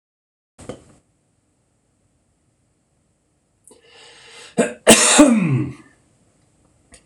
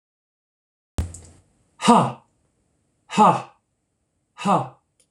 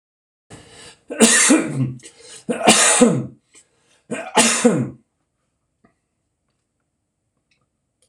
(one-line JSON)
{"cough_length": "7.1 s", "cough_amplitude": 26028, "cough_signal_mean_std_ratio": 0.29, "exhalation_length": "5.1 s", "exhalation_amplitude": 26027, "exhalation_signal_mean_std_ratio": 0.31, "three_cough_length": "8.1 s", "three_cough_amplitude": 26028, "three_cough_signal_mean_std_ratio": 0.4, "survey_phase": "beta (2021-08-13 to 2022-03-07)", "age": "45-64", "gender": "Male", "wearing_mask": "No", "symptom_cough_any": true, "symptom_runny_or_blocked_nose": true, "symptom_shortness_of_breath": true, "symptom_abdominal_pain": true, "symptom_fatigue": true, "symptom_headache": true, "symptom_change_to_sense_of_smell_or_taste": true, "smoker_status": "Never smoked", "respiratory_condition_asthma": false, "respiratory_condition_other": false, "recruitment_source": "Test and Trace", "submission_delay": "3 days", "covid_test_result": "Positive", "covid_test_method": "ePCR"}